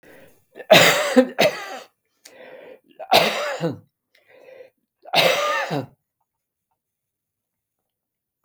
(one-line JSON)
{"three_cough_length": "8.4 s", "three_cough_amplitude": 32768, "three_cough_signal_mean_std_ratio": 0.36, "survey_phase": "beta (2021-08-13 to 2022-03-07)", "age": "65+", "gender": "Male", "wearing_mask": "No", "symptom_none": true, "smoker_status": "Never smoked", "respiratory_condition_asthma": false, "respiratory_condition_other": false, "recruitment_source": "REACT", "submission_delay": "2 days", "covid_test_result": "Negative", "covid_test_method": "RT-qPCR", "influenza_a_test_result": "Negative", "influenza_b_test_result": "Negative"}